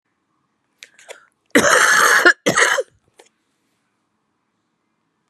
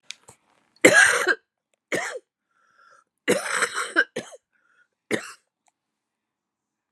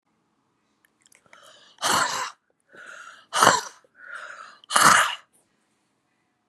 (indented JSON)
{
  "cough_length": "5.3 s",
  "cough_amplitude": 32767,
  "cough_signal_mean_std_ratio": 0.37,
  "three_cough_length": "6.9 s",
  "three_cough_amplitude": 32682,
  "three_cough_signal_mean_std_ratio": 0.32,
  "exhalation_length": "6.5 s",
  "exhalation_amplitude": 31597,
  "exhalation_signal_mean_std_ratio": 0.33,
  "survey_phase": "beta (2021-08-13 to 2022-03-07)",
  "age": "65+",
  "gender": "Female",
  "wearing_mask": "No",
  "symptom_none": true,
  "smoker_status": "Current smoker (1 to 10 cigarettes per day)",
  "respiratory_condition_asthma": false,
  "respiratory_condition_other": false,
  "recruitment_source": "REACT",
  "submission_delay": "1 day",
  "covid_test_result": "Negative",
  "covid_test_method": "RT-qPCR"
}